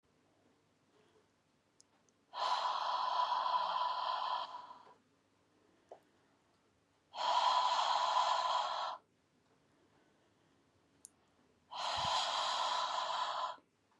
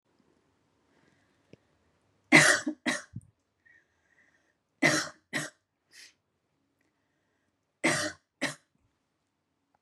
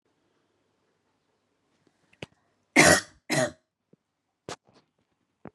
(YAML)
exhalation_length: 14.0 s
exhalation_amplitude: 2852
exhalation_signal_mean_std_ratio: 0.59
three_cough_length: 9.8 s
three_cough_amplitude: 22653
three_cough_signal_mean_std_ratio: 0.24
cough_length: 5.5 s
cough_amplitude: 25125
cough_signal_mean_std_ratio: 0.21
survey_phase: beta (2021-08-13 to 2022-03-07)
age: 45-64
gender: Female
wearing_mask: 'No'
symptom_none: true
smoker_status: Ex-smoker
respiratory_condition_asthma: false
respiratory_condition_other: false
recruitment_source: REACT
submission_delay: 2 days
covid_test_result: Negative
covid_test_method: RT-qPCR
influenza_a_test_result: Negative
influenza_b_test_result: Negative